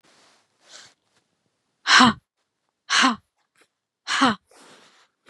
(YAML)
exhalation_length: 5.3 s
exhalation_amplitude: 27527
exhalation_signal_mean_std_ratio: 0.29
survey_phase: beta (2021-08-13 to 2022-03-07)
age: 45-64
gender: Female
wearing_mask: 'No'
symptom_fatigue: true
smoker_status: Ex-smoker
respiratory_condition_asthma: false
respiratory_condition_other: false
recruitment_source: REACT
submission_delay: 4 days
covid_test_result: Negative
covid_test_method: RT-qPCR